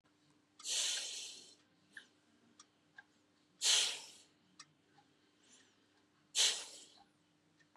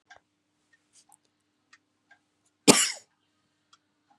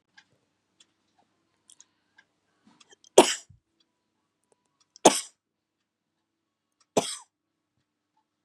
{"exhalation_length": "7.8 s", "exhalation_amplitude": 3753, "exhalation_signal_mean_std_ratio": 0.33, "cough_length": "4.2 s", "cough_amplitude": 32767, "cough_signal_mean_std_ratio": 0.16, "three_cough_length": "8.4 s", "three_cough_amplitude": 32767, "three_cough_signal_mean_std_ratio": 0.14, "survey_phase": "beta (2021-08-13 to 2022-03-07)", "age": "45-64", "gender": "Female", "wearing_mask": "No", "symptom_none": true, "smoker_status": "Never smoked", "respiratory_condition_asthma": false, "respiratory_condition_other": false, "recruitment_source": "REACT", "submission_delay": "7 days", "covid_test_result": "Negative", "covid_test_method": "RT-qPCR", "influenza_a_test_result": "Negative", "influenza_b_test_result": "Negative"}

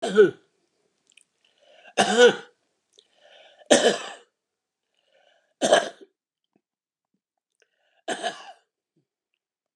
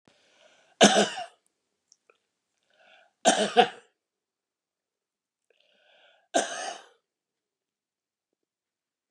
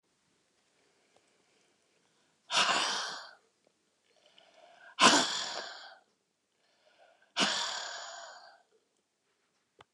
{"cough_length": "9.8 s", "cough_amplitude": 28439, "cough_signal_mean_std_ratio": 0.27, "three_cough_length": "9.1 s", "three_cough_amplitude": 23318, "three_cough_signal_mean_std_ratio": 0.23, "exhalation_length": "9.9 s", "exhalation_amplitude": 11591, "exhalation_signal_mean_std_ratio": 0.32, "survey_phase": "beta (2021-08-13 to 2022-03-07)", "age": "65+", "gender": "Male", "wearing_mask": "No", "symptom_cough_any": true, "smoker_status": "Never smoked", "respiratory_condition_asthma": false, "respiratory_condition_other": true, "recruitment_source": "REACT", "submission_delay": "7 days", "covid_test_result": "Negative", "covid_test_method": "RT-qPCR", "influenza_a_test_result": "Unknown/Void", "influenza_b_test_result": "Unknown/Void"}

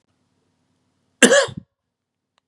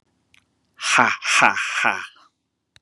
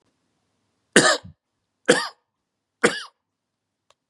{"cough_length": "2.5 s", "cough_amplitude": 32768, "cough_signal_mean_std_ratio": 0.24, "exhalation_length": "2.8 s", "exhalation_amplitude": 32767, "exhalation_signal_mean_std_ratio": 0.45, "three_cough_length": "4.1 s", "three_cough_amplitude": 32680, "three_cough_signal_mean_std_ratio": 0.25, "survey_phase": "beta (2021-08-13 to 2022-03-07)", "age": "45-64", "gender": "Male", "wearing_mask": "No", "symptom_none": true, "smoker_status": "Never smoked", "respiratory_condition_asthma": false, "respiratory_condition_other": false, "recruitment_source": "REACT", "submission_delay": "4 days", "covid_test_result": "Negative", "covid_test_method": "RT-qPCR", "influenza_a_test_result": "Negative", "influenza_b_test_result": "Negative"}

